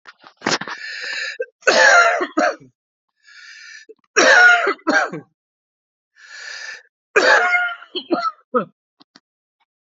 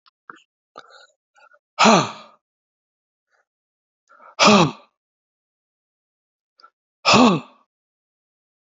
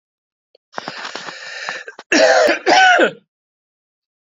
{"three_cough_length": "10.0 s", "three_cough_amplitude": 32767, "three_cough_signal_mean_std_ratio": 0.45, "exhalation_length": "8.6 s", "exhalation_amplitude": 29589, "exhalation_signal_mean_std_ratio": 0.26, "cough_length": "4.3 s", "cough_amplitude": 32767, "cough_signal_mean_std_ratio": 0.45, "survey_phase": "beta (2021-08-13 to 2022-03-07)", "age": "45-64", "gender": "Male", "wearing_mask": "No", "symptom_cough_any": true, "symptom_runny_or_blocked_nose": true, "symptom_fatigue": true, "smoker_status": "Never smoked", "respiratory_condition_asthma": false, "respiratory_condition_other": false, "recruitment_source": "Test and Trace", "submission_delay": "1 day", "covid_test_result": "Positive", "covid_test_method": "ePCR"}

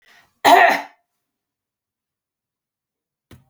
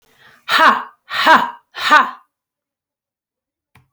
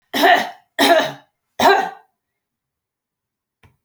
{"cough_length": "3.5 s", "cough_amplitude": 29493, "cough_signal_mean_std_ratio": 0.25, "exhalation_length": "3.9 s", "exhalation_amplitude": 32768, "exhalation_signal_mean_std_ratio": 0.38, "three_cough_length": "3.8 s", "three_cough_amplitude": 28957, "three_cough_signal_mean_std_ratio": 0.4, "survey_phase": "beta (2021-08-13 to 2022-03-07)", "age": "45-64", "gender": "Female", "wearing_mask": "No", "symptom_none": true, "smoker_status": "Never smoked", "respiratory_condition_asthma": false, "respiratory_condition_other": false, "recruitment_source": "REACT", "submission_delay": "1 day", "covid_test_result": "Negative", "covid_test_method": "RT-qPCR"}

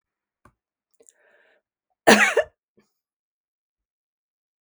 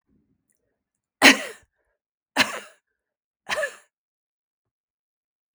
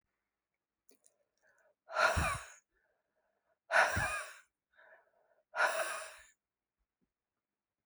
{"cough_length": "4.6 s", "cough_amplitude": 32768, "cough_signal_mean_std_ratio": 0.19, "three_cough_length": "5.5 s", "three_cough_amplitude": 32768, "three_cough_signal_mean_std_ratio": 0.19, "exhalation_length": "7.9 s", "exhalation_amplitude": 7887, "exhalation_signal_mean_std_ratio": 0.33, "survey_phase": "beta (2021-08-13 to 2022-03-07)", "age": "65+", "gender": "Female", "wearing_mask": "No", "symptom_none": true, "smoker_status": "Never smoked", "respiratory_condition_asthma": false, "respiratory_condition_other": false, "recruitment_source": "REACT", "submission_delay": "1 day", "covid_test_result": "Negative", "covid_test_method": "RT-qPCR"}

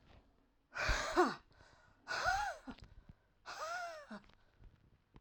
{"exhalation_length": "5.2 s", "exhalation_amplitude": 3748, "exhalation_signal_mean_std_ratio": 0.45, "survey_phase": "alpha (2021-03-01 to 2021-08-12)", "age": "45-64", "gender": "Female", "wearing_mask": "Yes", "symptom_cough_any": true, "symptom_abdominal_pain": true, "symptom_fatigue": true, "symptom_headache": true, "symptom_change_to_sense_of_smell_or_taste": true, "symptom_onset": "3 days", "smoker_status": "Ex-smoker", "respiratory_condition_asthma": true, "respiratory_condition_other": false, "recruitment_source": "Test and Trace", "submission_delay": "2 days", "covid_test_result": "Positive", "covid_test_method": "RT-qPCR", "covid_ct_value": 17.4, "covid_ct_gene": "ORF1ab gene", "covid_ct_mean": 17.9, "covid_viral_load": "1400000 copies/ml", "covid_viral_load_category": "High viral load (>1M copies/ml)"}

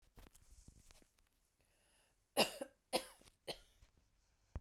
{"three_cough_length": "4.6 s", "three_cough_amplitude": 3401, "three_cough_signal_mean_std_ratio": 0.23, "survey_phase": "beta (2021-08-13 to 2022-03-07)", "age": "45-64", "gender": "Female", "wearing_mask": "No", "symptom_cough_any": true, "symptom_shortness_of_breath": true, "symptom_fatigue": true, "smoker_status": "Never smoked", "respiratory_condition_asthma": false, "respiratory_condition_other": false, "recruitment_source": "Test and Trace", "submission_delay": "1 day", "covid_test_result": "Positive", "covid_test_method": "RT-qPCR", "covid_ct_value": 32.0, "covid_ct_gene": "ORF1ab gene"}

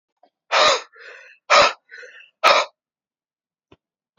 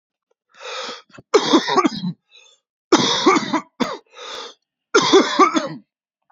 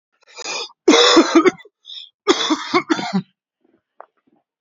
{"exhalation_length": "4.2 s", "exhalation_amplitude": 28427, "exhalation_signal_mean_std_ratio": 0.34, "three_cough_length": "6.3 s", "three_cough_amplitude": 28089, "three_cough_signal_mean_std_ratio": 0.46, "cough_length": "4.6 s", "cough_amplitude": 32768, "cough_signal_mean_std_ratio": 0.43, "survey_phase": "alpha (2021-03-01 to 2021-08-12)", "age": "18-44", "gender": "Male", "wearing_mask": "No", "symptom_new_continuous_cough": true, "symptom_fever_high_temperature": true, "symptom_change_to_sense_of_smell_or_taste": true, "symptom_loss_of_taste": true, "symptom_onset": "2 days", "smoker_status": "Current smoker (1 to 10 cigarettes per day)", "respiratory_condition_asthma": false, "respiratory_condition_other": false, "recruitment_source": "Test and Trace", "submission_delay": "2 days", "covid_test_result": "Positive", "covid_test_method": "RT-qPCR", "covid_ct_value": 13.6, "covid_ct_gene": "ORF1ab gene", "covid_ct_mean": 13.9, "covid_viral_load": "27000000 copies/ml", "covid_viral_load_category": "High viral load (>1M copies/ml)"}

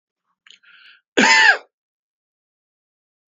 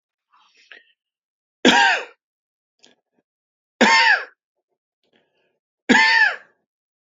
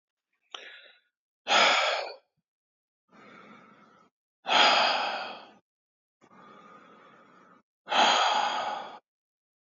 {"cough_length": "3.3 s", "cough_amplitude": 31175, "cough_signal_mean_std_ratio": 0.28, "three_cough_length": "7.2 s", "three_cough_amplitude": 31601, "three_cough_signal_mean_std_ratio": 0.34, "exhalation_length": "9.6 s", "exhalation_amplitude": 16948, "exhalation_signal_mean_std_ratio": 0.4, "survey_phase": "beta (2021-08-13 to 2022-03-07)", "age": "65+", "gender": "Male", "wearing_mask": "No", "symptom_runny_or_blocked_nose": true, "symptom_diarrhoea": true, "symptom_onset": "12 days", "smoker_status": "Ex-smoker", "respiratory_condition_asthma": false, "respiratory_condition_other": false, "recruitment_source": "REACT", "submission_delay": "1 day", "covid_test_result": "Negative", "covid_test_method": "RT-qPCR", "influenza_a_test_result": "Negative", "influenza_b_test_result": "Negative"}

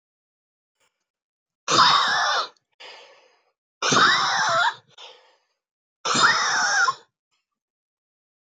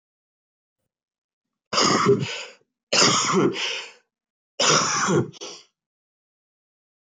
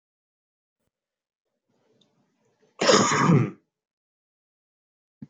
{"exhalation_length": "8.4 s", "exhalation_amplitude": 19430, "exhalation_signal_mean_std_ratio": 0.47, "three_cough_length": "7.1 s", "three_cough_amplitude": 18753, "three_cough_signal_mean_std_ratio": 0.46, "cough_length": "5.3 s", "cough_amplitude": 19110, "cough_signal_mean_std_ratio": 0.29, "survey_phase": "beta (2021-08-13 to 2022-03-07)", "age": "18-44", "gender": "Male", "wearing_mask": "No", "symptom_cough_any": true, "symptom_runny_or_blocked_nose": true, "symptom_sore_throat": true, "symptom_fatigue": true, "symptom_headache": true, "symptom_change_to_sense_of_smell_or_taste": true, "symptom_loss_of_taste": true, "symptom_other": true, "symptom_onset": "4 days", "smoker_status": "Never smoked", "respiratory_condition_asthma": false, "respiratory_condition_other": false, "recruitment_source": "Test and Trace", "submission_delay": "2 days", "covid_test_result": "Positive", "covid_test_method": "RT-qPCR", "covid_ct_value": 15.4, "covid_ct_gene": "ORF1ab gene", "covid_ct_mean": 15.7, "covid_viral_load": "6900000 copies/ml", "covid_viral_load_category": "High viral load (>1M copies/ml)"}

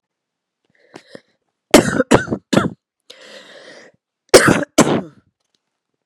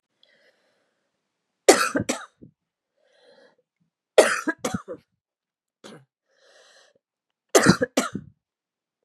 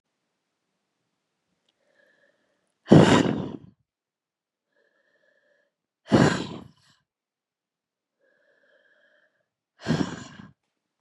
{"cough_length": "6.1 s", "cough_amplitude": 32768, "cough_signal_mean_std_ratio": 0.31, "three_cough_length": "9.0 s", "three_cough_amplitude": 31662, "three_cough_signal_mean_std_ratio": 0.24, "exhalation_length": "11.0 s", "exhalation_amplitude": 30985, "exhalation_signal_mean_std_ratio": 0.22, "survey_phase": "beta (2021-08-13 to 2022-03-07)", "age": "18-44", "gender": "Female", "wearing_mask": "No", "symptom_new_continuous_cough": true, "symptom_runny_or_blocked_nose": true, "symptom_fatigue": true, "symptom_headache": true, "smoker_status": "Never smoked", "respiratory_condition_asthma": false, "respiratory_condition_other": false, "recruitment_source": "Test and Trace", "submission_delay": "2 days", "covid_test_result": "Positive", "covid_test_method": "LFT"}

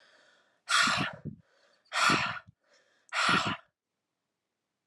{"exhalation_length": "4.9 s", "exhalation_amplitude": 8050, "exhalation_signal_mean_std_ratio": 0.43, "survey_phase": "alpha (2021-03-01 to 2021-08-12)", "age": "18-44", "gender": "Female", "wearing_mask": "No", "symptom_cough_any": true, "symptom_new_continuous_cough": true, "symptom_headache": true, "symptom_change_to_sense_of_smell_or_taste": true, "symptom_loss_of_taste": true, "symptom_onset": "4 days", "smoker_status": "Never smoked", "respiratory_condition_asthma": false, "respiratory_condition_other": false, "recruitment_source": "Test and Trace", "submission_delay": "2 days", "covid_test_result": "Positive", "covid_test_method": "RT-qPCR", "covid_ct_value": 13.6, "covid_ct_gene": "ORF1ab gene", "covid_ct_mean": 13.9, "covid_viral_load": "27000000 copies/ml", "covid_viral_load_category": "High viral load (>1M copies/ml)"}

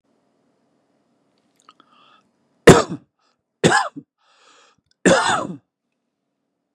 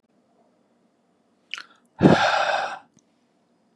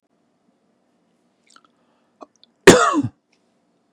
{"three_cough_length": "6.7 s", "three_cough_amplitude": 32768, "three_cough_signal_mean_std_ratio": 0.24, "exhalation_length": "3.8 s", "exhalation_amplitude": 26955, "exhalation_signal_mean_std_ratio": 0.32, "cough_length": "3.9 s", "cough_amplitude": 32768, "cough_signal_mean_std_ratio": 0.21, "survey_phase": "beta (2021-08-13 to 2022-03-07)", "age": "45-64", "gender": "Male", "wearing_mask": "No", "symptom_none": true, "smoker_status": "Ex-smoker", "respiratory_condition_asthma": false, "respiratory_condition_other": false, "recruitment_source": "REACT", "submission_delay": "2 days", "covid_test_result": "Negative", "covid_test_method": "RT-qPCR", "influenza_a_test_result": "Negative", "influenza_b_test_result": "Negative"}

